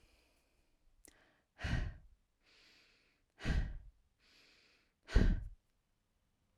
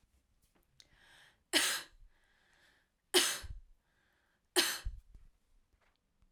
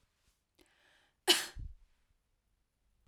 {"exhalation_length": "6.6 s", "exhalation_amplitude": 5576, "exhalation_signal_mean_std_ratio": 0.29, "three_cough_length": "6.3 s", "three_cough_amplitude": 8186, "three_cough_signal_mean_std_ratio": 0.29, "cough_length": "3.1 s", "cough_amplitude": 8466, "cough_signal_mean_std_ratio": 0.2, "survey_phase": "alpha (2021-03-01 to 2021-08-12)", "age": "45-64", "gender": "Female", "wearing_mask": "No", "symptom_none": true, "smoker_status": "Never smoked", "respiratory_condition_asthma": false, "respiratory_condition_other": false, "recruitment_source": "REACT", "submission_delay": "5 days", "covid_test_result": "Negative", "covid_test_method": "RT-qPCR"}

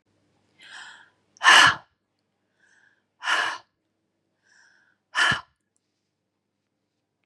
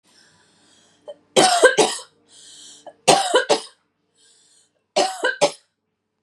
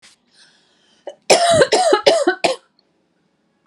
{"exhalation_length": "7.3 s", "exhalation_amplitude": 27843, "exhalation_signal_mean_std_ratio": 0.25, "three_cough_length": "6.2 s", "three_cough_amplitude": 32768, "three_cough_signal_mean_std_ratio": 0.37, "cough_length": "3.7 s", "cough_amplitude": 32768, "cough_signal_mean_std_ratio": 0.45, "survey_phase": "beta (2021-08-13 to 2022-03-07)", "age": "18-44", "gender": "Female", "wearing_mask": "No", "symptom_none": true, "smoker_status": "Ex-smoker", "respiratory_condition_asthma": false, "respiratory_condition_other": false, "recruitment_source": "REACT", "submission_delay": "1 day", "covid_test_result": "Negative", "covid_test_method": "RT-qPCR", "influenza_a_test_result": "Negative", "influenza_b_test_result": "Negative"}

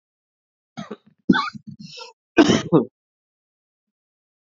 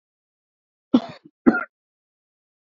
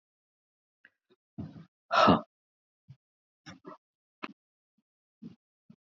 {"three_cough_length": "4.5 s", "three_cough_amplitude": 29184, "three_cough_signal_mean_std_ratio": 0.27, "cough_length": "2.6 s", "cough_amplitude": 27259, "cough_signal_mean_std_ratio": 0.2, "exhalation_length": "5.8 s", "exhalation_amplitude": 11410, "exhalation_signal_mean_std_ratio": 0.2, "survey_phase": "beta (2021-08-13 to 2022-03-07)", "age": "45-64", "gender": "Male", "wearing_mask": "No", "symptom_shortness_of_breath": true, "symptom_fatigue": true, "symptom_headache": true, "smoker_status": "Never smoked", "respiratory_condition_asthma": false, "respiratory_condition_other": false, "recruitment_source": "Test and Trace", "submission_delay": "3 days", "covid_test_result": "Positive", "covid_test_method": "RT-qPCR", "covid_ct_value": 23.7, "covid_ct_gene": "ORF1ab gene", "covid_ct_mean": 23.9, "covid_viral_load": "14000 copies/ml", "covid_viral_load_category": "Low viral load (10K-1M copies/ml)"}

